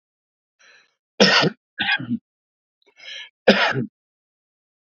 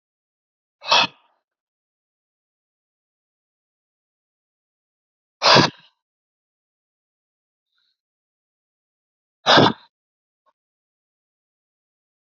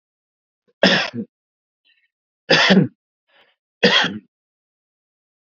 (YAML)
cough_length: 4.9 s
cough_amplitude: 32768
cough_signal_mean_std_ratio: 0.33
exhalation_length: 12.2 s
exhalation_amplitude: 32767
exhalation_signal_mean_std_ratio: 0.18
three_cough_length: 5.5 s
three_cough_amplitude: 29098
three_cough_signal_mean_std_ratio: 0.33
survey_phase: beta (2021-08-13 to 2022-03-07)
age: 45-64
gender: Male
wearing_mask: 'No'
symptom_none: true
smoker_status: Ex-smoker
respiratory_condition_asthma: false
respiratory_condition_other: false
recruitment_source: REACT
submission_delay: 1 day
covid_test_result: Negative
covid_test_method: RT-qPCR
influenza_a_test_result: Negative
influenza_b_test_result: Negative